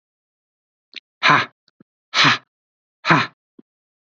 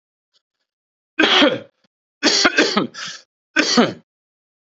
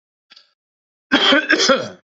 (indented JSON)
{
  "exhalation_length": "4.2 s",
  "exhalation_amplitude": 29852,
  "exhalation_signal_mean_std_ratio": 0.3,
  "three_cough_length": "4.6 s",
  "three_cough_amplitude": 30911,
  "three_cough_signal_mean_std_ratio": 0.43,
  "cough_length": "2.1 s",
  "cough_amplitude": 28282,
  "cough_signal_mean_std_ratio": 0.46,
  "survey_phase": "beta (2021-08-13 to 2022-03-07)",
  "age": "65+",
  "gender": "Male",
  "wearing_mask": "No",
  "symptom_none": true,
  "smoker_status": "Never smoked",
  "respiratory_condition_asthma": false,
  "respiratory_condition_other": false,
  "recruitment_source": "REACT",
  "submission_delay": "0 days",
  "covid_test_result": "Negative",
  "covid_test_method": "RT-qPCR",
  "influenza_a_test_result": "Negative",
  "influenza_b_test_result": "Negative"
}